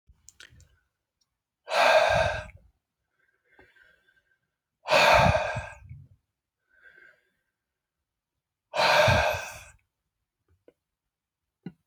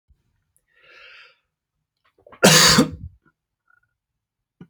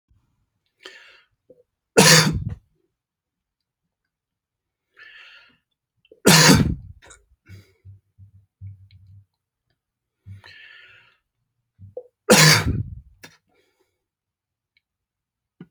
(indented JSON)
{
  "exhalation_length": "11.9 s",
  "exhalation_amplitude": 14094,
  "exhalation_signal_mean_std_ratio": 0.34,
  "cough_length": "4.7 s",
  "cough_amplitude": 31325,
  "cough_signal_mean_std_ratio": 0.26,
  "three_cough_length": "15.7 s",
  "three_cough_amplitude": 32768,
  "three_cough_signal_mean_std_ratio": 0.25,
  "survey_phase": "beta (2021-08-13 to 2022-03-07)",
  "age": "45-64",
  "gender": "Male",
  "wearing_mask": "No",
  "symptom_none": true,
  "smoker_status": "Never smoked",
  "respiratory_condition_asthma": false,
  "respiratory_condition_other": false,
  "recruitment_source": "REACT",
  "submission_delay": "2 days",
  "covid_test_result": "Negative",
  "covid_test_method": "RT-qPCR"
}